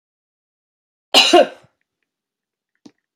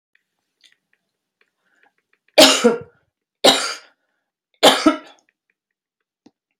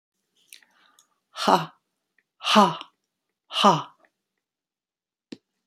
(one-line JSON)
{"cough_length": "3.2 s", "cough_amplitude": 30916, "cough_signal_mean_std_ratio": 0.25, "three_cough_length": "6.6 s", "three_cough_amplitude": 31875, "three_cough_signal_mean_std_ratio": 0.27, "exhalation_length": "5.7 s", "exhalation_amplitude": 26816, "exhalation_signal_mean_std_ratio": 0.27, "survey_phase": "beta (2021-08-13 to 2022-03-07)", "age": "65+", "gender": "Female", "wearing_mask": "No", "symptom_none": true, "smoker_status": "Never smoked", "respiratory_condition_asthma": false, "respiratory_condition_other": false, "recruitment_source": "REACT", "submission_delay": "1 day", "covid_test_result": "Negative", "covid_test_method": "RT-qPCR"}